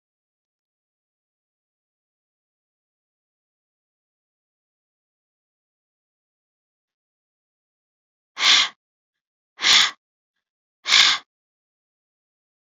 {"exhalation_length": "12.8 s", "exhalation_amplitude": 30767, "exhalation_signal_mean_std_ratio": 0.2, "survey_phase": "beta (2021-08-13 to 2022-03-07)", "age": "45-64", "gender": "Female", "wearing_mask": "No", "symptom_none": true, "smoker_status": "Never smoked", "respiratory_condition_asthma": false, "respiratory_condition_other": false, "recruitment_source": "REACT", "submission_delay": "1 day", "covid_test_result": "Negative", "covid_test_method": "RT-qPCR"}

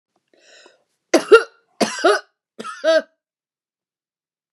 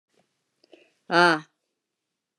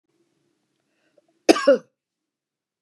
{"three_cough_length": "4.5 s", "three_cough_amplitude": 32767, "three_cough_signal_mean_std_ratio": 0.29, "exhalation_length": "2.4 s", "exhalation_amplitude": 22389, "exhalation_signal_mean_std_ratio": 0.24, "cough_length": "2.8 s", "cough_amplitude": 32355, "cough_signal_mean_std_ratio": 0.2, "survey_phase": "beta (2021-08-13 to 2022-03-07)", "age": "65+", "gender": "Female", "wearing_mask": "No", "symptom_none": true, "smoker_status": "Current smoker (1 to 10 cigarettes per day)", "respiratory_condition_asthma": false, "respiratory_condition_other": false, "recruitment_source": "REACT", "submission_delay": "3 days", "covid_test_result": "Negative", "covid_test_method": "RT-qPCR", "influenza_a_test_result": "Negative", "influenza_b_test_result": "Negative"}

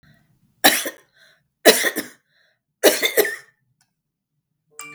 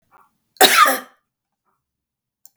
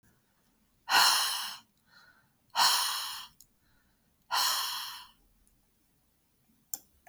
{"three_cough_length": "4.9 s", "three_cough_amplitude": 32768, "three_cough_signal_mean_std_ratio": 0.31, "cough_length": "2.6 s", "cough_amplitude": 32768, "cough_signal_mean_std_ratio": 0.29, "exhalation_length": "7.1 s", "exhalation_amplitude": 11018, "exhalation_signal_mean_std_ratio": 0.39, "survey_phase": "beta (2021-08-13 to 2022-03-07)", "age": "65+", "gender": "Female", "wearing_mask": "No", "symptom_none": true, "smoker_status": "Never smoked", "respiratory_condition_asthma": true, "respiratory_condition_other": false, "recruitment_source": "REACT", "submission_delay": "2 days", "covid_test_result": "Negative", "covid_test_method": "RT-qPCR", "influenza_a_test_result": "Negative", "influenza_b_test_result": "Negative"}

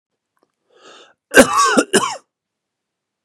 {"cough_length": "3.2 s", "cough_amplitude": 32768, "cough_signal_mean_std_ratio": 0.33, "survey_phase": "beta (2021-08-13 to 2022-03-07)", "age": "18-44", "gender": "Male", "wearing_mask": "No", "symptom_none": true, "symptom_onset": "5 days", "smoker_status": "Never smoked", "respiratory_condition_asthma": false, "respiratory_condition_other": false, "recruitment_source": "Test and Trace", "submission_delay": "2 days", "covid_test_result": "Positive", "covid_test_method": "RT-qPCR", "covid_ct_value": 18.1, "covid_ct_gene": "ORF1ab gene", "covid_ct_mean": 18.4, "covid_viral_load": "890000 copies/ml", "covid_viral_load_category": "Low viral load (10K-1M copies/ml)"}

